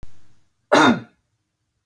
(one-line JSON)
{"cough_length": "1.9 s", "cough_amplitude": 27425, "cough_signal_mean_std_ratio": 0.36, "survey_phase": "beta (2021-08-13 to 2022-03-07)", "age": "45-64", "gender": "Female", "wearing_mask": "No", "symptom_none": true, "smoker_status": "Never smoked", "respiratory_condition_asthma": false, "respiratory_condition_other": false, "recruitment_source": "REACT", "submission_delay": "-2 days", "covid_test_result": "Negative", "covid_test_method": "RT-qPCR", "influenza_a_test_result": "Negative", "influenza_b_test_result": "Negative"}